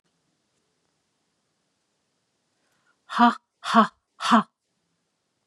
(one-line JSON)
{"exhalation_length": "5.5 s", "exhalation_amplitude": 22177, "exhalation_signal_mean_std_ratio": 0.24, "survey_phase": "beta (2021-08-13 to 2022-03-07)", "age": "45-64", "gender": "Female", "wearing_mask": "No", "symptom_none": true, "smoker_status": "Never smoked", "respiratory_condition_asthma": false, "respiratory_condition_other": false, "recruitment_source": "REACT", "submission_delay": "1 day", "covid_test_result": "Negative", "covid_test_method": "RT-qPCR", "influenza_a_test_result": "Negative", "influenza_b_test_result": "Negative"}